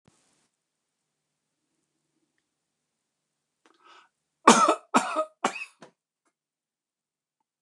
{"three_cough_length": "7.6 s", "three_cough_amplitude": 29203, "three_cough_signal_mean_std_ratio": 0.2, "survey_phase": "beta (2021-08-13 to 2022-03-07)", "age": "65+", "gender": "Male", "wearing_mask": "No", "symptom_none": true, "smoker_status": "Ex-smoker", "respiratory_condition_asthma": false, "respiratory_condition_other": false, "recruitment_source": "REACT", "submission_delay": "1 day", "covid_test_result": "Negative", "covid_test_method": "RT-qPCR", "influenza_a_test_result": "Negative", "influenza_b_test_result": "Negative"}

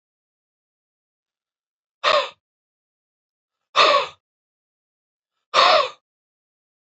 {"exhalation_length": "6.9 s", "exhalation_amplitude": 27892, "exhalation_signal_mean_std_ratio": 0.28, "survey_phase": "beta (2021-08-13 to 2022-03-07)", "age": "45-64", "gender": "Male", "wearing_mask": "No", "symptom_none": true, "smoker_status": "Never smoked", "respiratory_condition_asthma": false, "respiratory_condition_other": false, "recruitment_source": "REACT", "submission_delay": "2 days", "covid_test_result": "Negative", "covid_test_method": "RT-qPCR", "influenza_a_test_result": "Negative", "influenza_b_test_result": "Negative"}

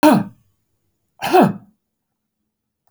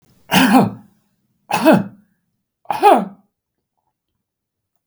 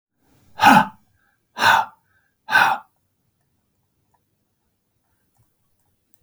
{"cough_length": "2.9 s", "cough_amplitude": 32598, "cough_signal_mean_std_ratio": 0.33, "three_cough_length": "4.9 s", "three_cough_amplitude": 32768, "three_cough_signal_mean_std_ratio": 0.36, "exhalation_length": "6.2 s", "exhalation_amplitude": 32727, "exhalation_signal_mean_std_ratio": 0.27, "survey_phase": "beta (2021-08-13 to 2022-03-07)", "age": "65+", "gender": "Male", "wearing_mask": "No", "symptom_none": true, "smoker_status": "Never smoked", "respiratory_condition_asthma": false, "respiratory_condition_other": true, "recruitment_source": "REACT", "submission_delay": "2 days", "covid_test_result": "Negative", "covid_test_method": "RT-qPCR", "influenza_a_test_result": "Negative", "influenza_b_test_result": "Negative"}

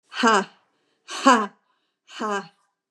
{"exhalation_length": "2.9 s", "exhalation_amplitude": 28415, "exhalation_signal_mean_std_ratio": 0.37, "survey_phase": "beta (2021-08-13 to 2022-03-07)", "age": "65+", "gender": "Female", "wearing_mask": "No", "symptom_cough_any": true, "smoker_status": "Ex-smoker", "respiratory_condition_asthma": false, "respiratory_condition_other": false, "recruitment_source": "REACT", "submission_delay": "2 days", "covid_test_result": "Negative", "covid_test_method": "RT-qPCR", "influenza_a_test_result": "Negative", "influenza_b_test_result": "Negative"}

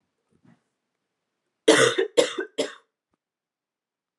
{"cough_length": "4.2 s", "cough_amplitude": 24334, "cough_signal_mean_std_ratio": 0.28, "survey_phase": "alpha (2021-03-01 to 2021-08-12)", "age": "18-44", "gender": "Female", "wearing_mask": "No", "symptom_cough_any": true, "symptom_new_continuous_cough": true, "symptom_fatigue": true, "symptom_headache": true, "symptom_onset": "6 days", "smoker_status": "Never smoked", "respiratory_condition_asthma": false, "respiratory_condition_other": false, "recruitment_source": "Test and Trace", "submission_delay": "2 days", "covid_test_result": "Positive", "covid_test_method": "RT-qPCR", "covid_ct_value": 17.3, "covid_ct_gene": "ORF1ab gene", "covid_ct_mean": 18.3, "covid_viral_load": "1000000 copies/ml", "covid_viral_load_category": "High viral load (>1M copies/ml)"}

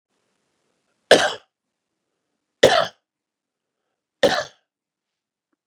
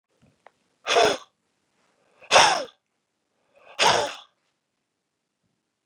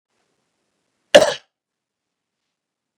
{"three_cough_length": "5.7 s", "three_cough_amplitude": 32768, "three_cough_signal_mean_std_ratio": 0.23, "exhalation_length": "5.9 s", "exhalation_amplitude": 28300, "exhalation_signal_mean_std_ratio": 0.3, "cough_length": "3.0 s", "cough_amplitude": 32768, "cough_signal_mean_std_ratio": 0.16, "survey_phase": "beta (2021-08-13 to 2022-03-07)", "age": "65+", "gender": "Male", "wearing_mask": "No", "symptom_cough_any": true, "symptom_runny_or_blocked_nose": true, "symptom_sore_throat": true, "symptom_abdominal_pain": true, "symptom_fatigue": true, "symptom_onset": "3 days", "smoker_status": "Never smoked", "respiratory_condition_asthma": true, "respiratory_condition_other": false, "recruitment_source": "Test and Trace", "submission_delay": "1 day", "covid_test_result": "Positive", "covid_test_method": "RT-qPCR", "covid_ct_value": 15.8, "covid_ct_gene": "N gene"}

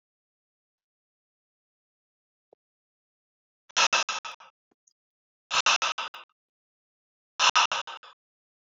{"exhalation_length": "8.8 s", "exhalation_amplitude": 15383, "exhalation_signal_mean_std_ratio": 0.26, "survey_phase": "beta (2021-08-13 to 2022-03-07)", "age": "45-64", "gender": "Male", "wearing_mask": "No", "symptom_none": true, "smoker_status": "Never smoked", "respiratory_condition_asthma": false, "respiratory_condition_other": false, "recruitment_source": "REACT", "submission_delay": "1 day", "covid_test_result": "Negative", "covid_test_method": "RT-qPCR", "influenza_a_test_result": "Unknown/Void", "influenza_b_test_result": "Unknown/Void"}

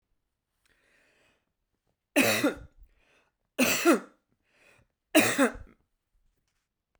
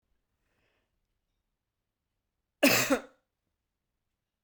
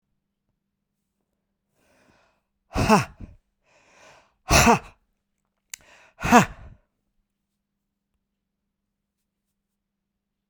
{"three_cough_length": "7.0 s", "three_cough_amplitude": 16116, "three_cough_signal_mean_std_ratio": 0.31, "cough_length": "4.4 s", "cough_amplitude": 10391, "cough_signal_mean_std_ratio": 0.21, "exhalation_length": "10.5 s", "exhalation_amplitude": 29678, "exhalation_signal_mean_std_ratio": 0.21, "survey_phase": "beta (2021-08-13 to 2022-03-07)", "age": "45-64", "gender": "Male", "wearing_mask": "No", "symptom_change_to_sense_of_smell_or_taste": true, "symptom_loss_of_taste": true, "symptom_onset": "8 days", "smoker_status": "Never smoked", "respiratory_condition_asthma": false, "respiratory_condition_other": false, "recruitment_source": "Test and Trace", "submission_delay": "2 days", "covid_test_result": "Positive", "covid_test_method": "RT-qPCR", "covid_ct_value": 27.8, "covid_ct_gene": "N gene"}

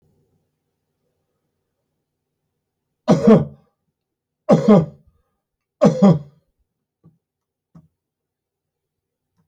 {"three_cough_length": "9.5 s", "three_cough_amplitude": 29485, "three_cough_signal_mean_std_ratio": 0.25, "survey_phase": "beta (2021-08-13 to 2022-03-07)", "age": "65+", "gender": "Male", "wearing_mask": "No", "symptom_headache": true, "symptom_onset": "12 days", "smoker_status": "Ex-smoker", "respiratory_condition_asthma": false, "respiratory_condition_other": false, "recruitment_source": "REACT", "submission_delay": "3 days", "covid_test_result": "Negative", "covid_test_method": "RT-qPCR"}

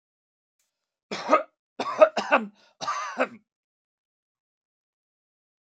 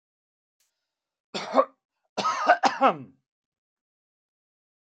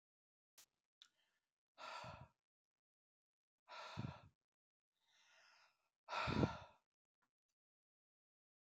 {"three_cough_length": "5.6 s", "three_cough_amplitude": 24155, "three_cough_signal_mean_std_ratio": 0.27, "cough_length": "4.9 s", "cough_amplitude": 17132, "cough_signal_mean_std_ratio": 0.29, "exhalation_length": "8.6 s", "exhalation_amplitude": 2237, "exhalation_signal_mean_std_ratio": 0.25, "survey_phase": "alpha (2021-03-01 to 2021-08-12)", "age": "65+", "gender": "Male", "wearing_mask": "No", "symptom_none": true, "smoker_status": "Never smoked", "respiratory_condition_asthma": false, "respiratory_condition_other": false, "recruitment_source": "REACT", "submission_delay": "2 days", "covid_test_result": "Negative", "covid_test_method": "RT-qPCR"}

